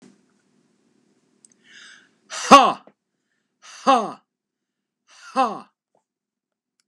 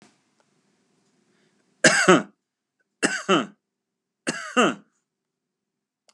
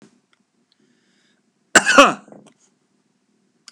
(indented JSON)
{
  "exhalation_length": "6.9 s",
  "exhalation_amplitude": 32768,
  "exhalation_signal_mean_std_ratio": 0.22,
  "three_cough_length": "6.1 s",
  "three_cough_amplitude": 30420,
  "three_cough_signal_mean_std_ratio": 0.28,
  "cough_length": "3.7 s",
  "cough_amplitude": 32768,
  "cough_signal_mean_std_ratio": 0.22,
  "survey_phase": "beta (2021-08-13 to 2022-03-07)",
  "age": "45-64",
  "gender": "Male",
  "wearing_mask": "No",
  "symptom_none": true,
  "smoker_status": "Never smoked",
  "respiratory_condition_asthma": false,
  "respiratory_condition_other": false,
  "recruitment_source": "REACT",
  "submission_delay": "2 days",
  "covid_test_result": "Negative",
  "covid_test_method": "RT-qPCR",
  "influenza_a_test_result": "Negative",
  "influenza_b_test_result": "Negative"
}